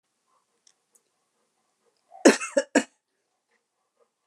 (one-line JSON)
{"cough_length": "4.3 s", "cough_amplitude": 26897, "cough_signal_mean_std_ratio": 0.18, "survey_phase": "alpha (2021-03-01 to 2021-08-12)", "age": "65+", "gender": "Female", "wearing_mask": "No", "symptom_none": true, "smoker_status": "Ex-smoker", "respiratory_condition_asthma": false, "respiratory_condition_other": false, "recruitment_source": "REACT", "submission_delay": "3 days", "covid_test_result": "Negative", "covid_test_method": "RT-qPCR"}